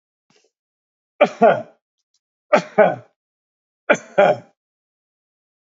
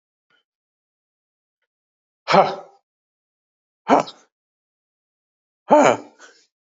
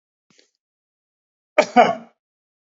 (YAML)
three_cough_length: 5.7 s
three_cough_amplitude: 28308
three_cough_signal_mean_std_ratio: 0.29
exhalation_length: 6.7 s
exhalation_amplitude: 31832
exhalation_signal_mean_std_ratio: 0.23
cough_length: 2.6 s
cough_amplitude: 27613
cough_signal_mean_std_ratio: 0.23
survey_phase: alpha (2021-03-01 to 2021-08-12)
age: 45-64
gender: Male
wearing_mask: 'No'
symptom_none: true
smoker_status: Never smoked
respiratory_condition_asthma: false
respiratory_condition_other: false
recruitment_source: REACT
submission_delay: 1 day
covid_test_result: Negative
covid_test_method: RT-qPCR